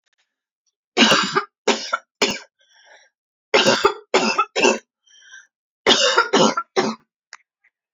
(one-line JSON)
{"three_cough_length": "7.9 s", "three_cough_amplitude": 30170, "three_cough_signal_mean_std_ratio": 0.44, "survey_phase": "alpha (2021-03-01 to 2021-08-12)", "age": "45-64", "gender": "Female", "wearing_mask": "No", "symptom_none": true, "smoker_status": "Current smoker (1 to 10 cigarettes per day)", "respiratory_condition_asthma": false, "respiratory_condition_other": false, "recruitment_source": "REACT", "submission_delay": "1 day", "covid_test_result": "Negative", "covid_test_method": "RT-qPCR"}